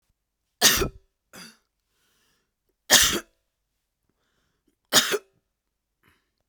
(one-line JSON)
{"three_cough_length": "6.5 s", "three_cough_amplitude": 32767, "three_cough_signal_mean_std_ratio": 0.26, "survey_phase": "beta (2021-08-13 to 2022-03-07)", "age": "18-44", "gender": "Female", "wearing_mask": "No", "symptom_cough_any": true, "smoker_status": "Ex-smoker", "respiratory_condition_asthma": false, "respiratory_condition_other": false, "recruitment_source": "Test and Trace", "submission_delay": "1 day", "covid_test_result": "Negative", "covid_test_method": "ePCR"}